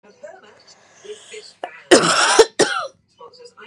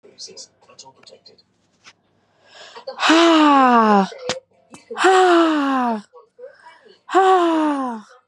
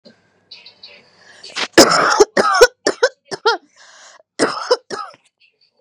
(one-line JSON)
{"cough_length": "3.7 s", "cough_amplitude": 32768, "cough_signal_mean_std_ratio": 0.38, "exhalation_length": "8.3 s", "exhalation_amplitude": 29993, "exhalation_signal_mean_std_ratio": 0.54, "three_cough_length": "5.8 s", "three_cough_amplitude": 32768, "three_cough_signal_mean_std_ratio": 0.38, "survey_phase": "beta (2021-08-13 to 2022-03-07)", "age": "18-44", "gender": "Female", "wearing_mask": "No", "symptom_cough_any": true, "symptom_sore_throat": true, "symptom_fatigue": true, "symptom_onset": "7 days", "smoker_status": "Never smoked", "respiratory_condition_asthma": false, "respiratory_condition_other": false, "recruitment_source": "REACT", "submission_delay": "3 days", "covid_test_result": "Negative", "covid_test_method": "RT-qPCR", "influenza_a_test_result": "Negative", "influenza_b_test_result": "Negative"}